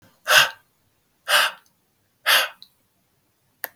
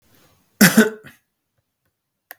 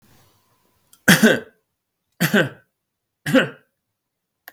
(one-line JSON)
{"exhalation_length": "3.8 s", "exhalation_amplitude": 31508, "exhalation_signal_mean_std_ratio": 0.33, "cough_length": "2.4 s", "cough_amplitude": 32768, "cough_signal_mean_std_ratio": 0.26, "three_cough_length": "4.5 s", "three_cough_amplitude": 32768, "three_cough_signal_mean_std_ratio": 0.3, "survey_phase": "beta (2021-08-13 to 2022-03-07)", "age": "45-64", "gender": "Male", "wearing_mask": "No", "symptom_none": true, "smoker_status": "Never smoked", "respiratory_condition_asthma": false, "respiratory_condition_other": false, "recruitment_source": "REACT", "submission_delay": "2 days", "covid_test_result": "Negative", "covid_test_method": "RT-qPCR", "influenza_a_test_result": "Negative", "influenza_b_test_result": "Negative"}